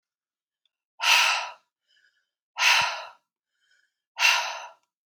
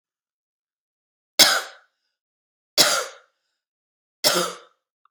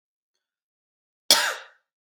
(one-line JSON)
{"exhalation_length": "5.1 s", "exhalation_amplitude": 17516, "exhalation_signal_mean_std_ratio": 0.38, "three_cough_length": "5.1 s", "three_cough_amplitude": 32768, "three_cough_signal_mean_std_ratio": 0.28, "cough_length": "2.1 s", "cough_amplitude": 32768, "cough_signal_mean_std_ratio": 0.23, "survey_phase": "beta (2021-08-13 to 2022-03-07)", "age": "18-44", "gender": "Female", "wearing_mask": "No", "symptom_runny_or_blocked_nose": true, "symptom_sore_throat": true, "symptom_headache": true, "symptom_change_to_sense_of_smell_or_taste": true, "symptom_loss_of_taste": true, "symptom_onset": "2 days", "smoker_status": "Current smoker (1 to 10 cigarettes per day)", "respiratory_condition_asthma": false, "respiratory_condition_other": false, "recruitment_source": "Test and Trace", "submission_delay": "1 day", "covid_test_result": "Positive", "covid_test_method": "RT-qPCR", "covid_ct_value": 18.0, "covid_ct_gene": "ORF1ab gene"}